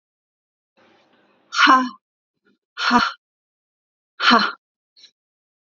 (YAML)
exhalation_length: 5.7 s
exhalation_amplitude: 28017
exhalation_signal_mean_std_ratio: 0.31
survey_phase: beta (2021-08-13 to 2022-03-07)
age: 45-64
gender: Female
wearing_mask: 'No'
symptom_cough_any: true
symptom_runny_or_blocked_nose: true
symptom_onset: 5 days
smoker_status: Never smoked
respiratory_condition_asthma: false
respiratory_condition_other: false
recruitment_source: REACT
submission_delay: 1 day
covid_test_result: Negative
covid_test_method: RT-qPCR
influenza_a_test_result: Negative
influenza_b_test_result: Negative